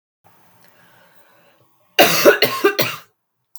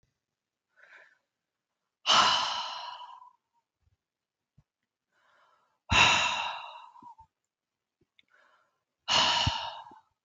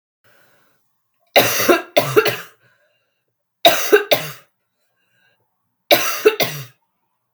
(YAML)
cough_length: 3.6 s
cough_amplitude: 32768
cough_signal_mean_std_ratio: 0.35
exhalation_length: 10.2 s
exhalation_amplitude: 15035
exhalation_signal_mean_std_ratio: 0.35
three_cough_length: 7.3 s
three_cough_amplitude: 32768
three_cough_signal_mean_std_ratio: 0.36
survey_phase: beta (2021-08-13 to 2022-03-07)
age: 45-64
gender: Female
wearing_mask: 'No'
symptom_cough_any: true
symptom_onset: 11 days
smoker_status: Ex-smoker
respiratory_condition_asthma: true
respiratory_condition_other: false
recruitment_source: REACT
submission_delay: 4 days
covid_test_result: Negative
covid_test_method: RT-qPCR
influenza_a_test_result: Negative
influenza_b_test_result: Negative